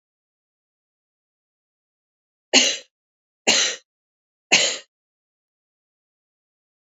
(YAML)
three_cough_length: 6.8 s
three_cough_amplitude: 32767
three_cough_signal_mean_std_ratio: 0.24
survey_phase: beta (2021-08-13 to 2022-03-07)
age: 18-44
gender: Female
wearing_mask: 'No'
symptom_cough_any: true
symptom_runny_or_blocked_nose: true
symptom_shortness_of_breath: true
symptom_sore_throat: true
symptom_headache: true
symptom_change_to_sense_of_smell_or_taste: true
symptom_loss_of_taste: true
symptom_other: true
smoker_status: Ex-smoker
respiratory_condition_asthma: false
respiratory_condition_other: false
recruitment_source: Test and Trace
submission_delay: 2 days
covid_test_result: Positive
covid_test_method: RT-qPCR
covid_ct_value: 25.1
covid_ct_gene: N gene